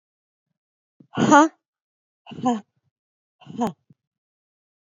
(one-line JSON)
{"exhalation_length": "4.9 s", "exhalation_amplitude": 27939, "exhalation_signal_mean_std_ratio": 0.25, "survey_phase": "beta (2021-08-13 to 2022-03-07)", "age": "45-64", "gender": "Female", "wearing_mask": "No", "symptom_cough_any": true, "symptom_runny_or_blocked_nose": true, "symptom_onset": "5 days", "smoker_status": "Never smoked", "respiratory_condition_asthma": true, "respiratory_condition_other": false, "recruitment_source": "Test and Trace", "submission_delay": "1 day", "covid_test_result": "Positive", "covid_test_method": "RT-qPCR", "covid_ct_value": 17.1, "covid_ct_gene": "ORF1ab gene", "covid_ct_mean": 18.5, "covid_viral_load": "860000 copies/ml", "covid_viral_load_category": "Low viral load (10K-1M copies/ml)"}